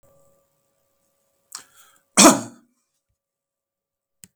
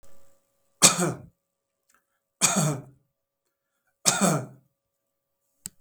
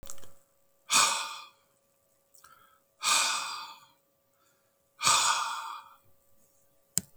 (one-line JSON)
{"cough_length": "4.4 s", "cough_amplitude": 32768, "cough_signal_mean_std_ratio": 0.18, "three_cough_length": "5.8 s", "three_cough_amplitude": 32768, "three_cough_signal_mean_std_ratio": 0.32, "exhalation_length": "7.2 s", "exhalation_amplitude": 21451, "exhalation_signal_mean_std_ratio": 0.41, "survey_phase": "beta (2021-08-13 to 2022-03-07)", "age": "65+", "gender": "Male", "wearing_mask": "No", "symptom_runny_or_blocked_nose": true, "smoker_status": "Never smoked", "respiratory_condition_asthma": false, "respiratory_condition_other": false, "recruitment_source": "REACT", "submission_delay": "3 days", "covid_test_result": "Negative", "covid_test_method": "RT-qPCR", "influenza_a_test_result": "Negative", "influenza_b_test_result": "Negative"}